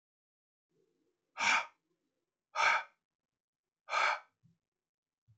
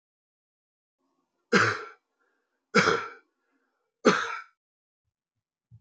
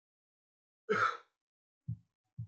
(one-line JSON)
{"exhalation_length": "5.4 s", "exhalation_amplitude": 4516, "exhalation_signal_mean_std_ratio": 0.31, "three_cough_length": "5.8 s", "three_cough_amplitude": 16496, "three_cough_signal_mean_std_ratio": 0.28, "cough_length": "2.5 s", "cough_amplitude": 3264, "cough_signal_mean_std_ratio": 0.31, "survey_phase": "beta (2021-08-13 to 2022-03-07)", "age": "18-44", "gender": "Male", "wearing_mask": "No", "symptom_none": true, "symptom_onset": "5 days", "smoker_status": "Never smoked", "respiratory_condition_asthma": false, "respiratory_condition_other": false, "recruitment_source": "REACT", "submission_delay": "2 days", "covid_test_result": "Negative", "covid_test_method": "RT-qPCR", "influenza_a_test_result": "Negative", "influenza_b_test_result": "Negative"}